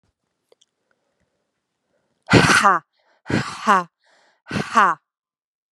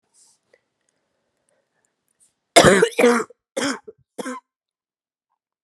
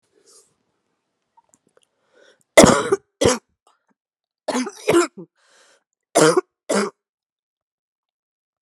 {
  "exhalation_length": "5.7 s",
  "exhalation_amplitude": 31765,
  "exhalation_signal_mean_std_ratio": 0.33,
  "cough_length": "5.6 s",
  "cough_amplitude": 32768,
  "cough_signal_mean_std_ratio": 0.28,
  "three_cough_length": "8.6 s",
  "three_cough_amplitude": 32768,
  "three_cough_signal_mean_std_ratio": 0.28,
  "survey_phase": "alpha (2021-03-01 to 2021-08-12)",
  "age": "18-44",
  "gender": "Female",
  "wearing_mask": "No",
  "symptom_cough_any": true,
  "symptom_fatigue": true,
  "symptom_fever_high_temperature": true,
  "symptom_headache": true,
  "symptom_change_to_sense_of_smell_or_taste": true,
  "symptom_loss_of_taste": true,
  "symptom_onset": "2 days",
  "smoker_status": "Never smoked",
  "respiratory_condition_asthma": true,
  "respiratory_condition_other": false,
  "recruitment_source": "Test and Trace",
  "submission_delay": "2 days",
  "covid_test_result": "Positive",
  "covid_test_method": "RT-qPCR",
  "covid_ct_value": 24.1,
  "covid_ct_gene": "ORF1ab gene",
  "covid_ct_mean": 24.5,
  "covid_viral_load": "9000 copies/ml",
  "covid_viral_load_category": "Minimal viral load (< 10K copies/ml)"
}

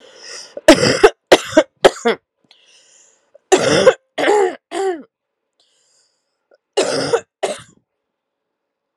{
  "three_cough_length": "9.0 s",
  "three_cough_amplitude": 32768,
  "three_cough_signal_mean_std_ratio": 0.36,
  "survey_phase": "beta (2021-08-13 to 2022-03-07)",
  "age": "18-44",
  "gender": "Female",
  "wearing_mask": "No",
  "symptom_cough_any": true,
  "symptom_runny_or_blocked_nose": true,
  "symptom_shortness_of_breath": true,
  "symptom_fatigue": true,
  "symptom_headache": true,
  "symptom_change_to_sense_of_smell_or_taste": true,
  "symptom_loss_of_taste": true,
  "symptom_other": true,
  "symptom_onset": "5 days",
  "smoker_status": "Never smoked",
  "respiratory_condition_asthma": false,
  "respiratory_condition_other": false,
  "recruitment_source": "Test and Trace",
  "submission_delay": "2 days",
  "covid_test_result": "Positive",
  "covid_test_method": "RT-qPCR",
  "covid_ct_value": 19.2,
  "covid_ct_gene": "ORF1ab gene",
  "covid_ct_mean": 19.3,
  "covid_viral_load": "480000 copies/ml",
  "covid_viral_load_category": "Low viral load (10K-1M copies/ml)"
}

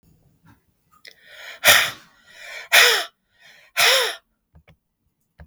{
  "exhalation_length": "5.5 s",
  "exhalation_amplitude": 32768,
  "exhalation_signal_mean_std_ratio": 0.34,
  "survey_phase": "beta (2021-08-13 to 2022-03-07)",
  "age": "18-44",
  "gender": "Male",
  "wearing_mask": "No",
  "symptom_none": true,
  "symptom_onset": "3 days",
  "smoker_status": "Never smoked",
  "respiratory_condition_asthma": false,
  "respiratory_condition_other": false,
  "recruitment_source": "REACT",
  "submission_delay": "1 day",
  "covid_test_result": "Negative",
  "covid_test_method": "RT-qPCR",
  "influenza_a_test_result": "Unknown/Void",
  "influenza_b_test_result": "Unknown/Void"
}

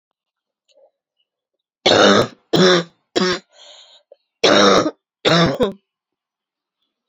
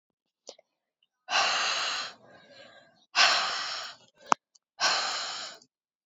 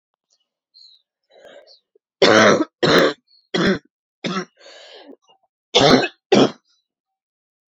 {
  "cough_length": "7.1 s",
  "cough_amplitude": 30655,
  "cough_signal_mean_std_ratio": 0.42,
  "exhalation_length": "6.1 s",
  "exhalation_amplitude": 29938,
  "exhalation_signal_mean_std_ratio": 0.46,
  "three_cough_length": "7.7 s",
  "three_cough_amplitude": 30319,
  "three_cough_signal_mean_std_ratio": 0.37,
  "survey_phase": "alpha (2021-03-01 to 2021-08-12)",
  "age": "18-44",
  "gender": "Female",
  "wearing_mask": "No",
  "symptom_cough_any": true,
  "symptom_shortness_of_breath": true,
  "symptom_fatigue": true,
  "symptom_headache": true,
  "smoker_status": "Never smoked",
  "respiratory_condition_asthma": false,
  "respiratory_condition_other": false,
  "recruitment_source": "Test and Trace",
  "submission_delay": "2 days",
  "covid_test_result": "Positive",
  "covid_test_method": "RT-qPCR",
  "covid_ct_value": 19.9,
  "covid_ct_gene": "ORF1ab gene",
  "covid_ct_mean": 20.6,
  "covid_viral_load": "170000 copies/ml",
  "covid_viral_load_category": "Low viral load (10K-1M copies/ml)"
}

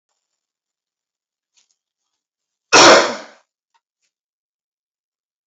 {
  "cough_length": "5.5 s",
  "cough_amplitude": 32768,
  "cough_signal_mean_std_ratio": 0.22,
  "survey_phase": "beta (2021-08-13 to 2022-03-07)",
  "age": "45-64",
  "gender": "Male",
  "wearing_mask": "No",
  "symptom_none": true,
  "smoker_status": "Ex-smoker",
  "respiratory_condition_asthma": false,
  "respiratory_condition_other": false,
  "recruitment_source": "REACT",
  "submission_delay": "2 days",
  "covid_test_result": "Negative",
  "covid_test_method": "RT-qPCR",
  "influenza_a_test_result": "Negative",
  "influenza_b_test_result": "Negative"
}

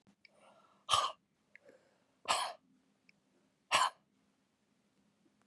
{
  "exhalation_length": "5.5 s",
  "exhalation_amplitude": 6260,
  "exhalation_signal_mean_std_ratio": 0.27,
  "survey_phase": "beta (2021-08-13 to 2022-03-07)",
  "age": "18-44",
  "gender": "Female",
  "wearing_mask": "No",
  "symptom_cough_any": true,
  "symptom_runny_or_blocked_nose": true,
  "symptom_fatigue": true,
  "symptom_fever_high_temperature": true,
  "symptom_headache": true,
  "symptom_change_to_sense_of_smell_or_taste": true,
  "symptom_other": true,
  "smoker_status": "Never smoked",
  "respiratory_condition_asthma": false,
  "respiratory_condition_other": false,
  "recruitment_source": "Test and Trace",
  "submission_delay": "1 day",
  "covid_test_result": "Positive",
  "covid_test_method": "RT-qPCR",
  "covid_ct_value": 29.0,
  "covid_ct_gene": "ORF1ab gene",
  "covid_ct_mean": 29.5,
  "covid_viral_load": "210 copies/ml",
  "covid_viral_load_category": "Minimal viral load (< 10K copies/ml)"
}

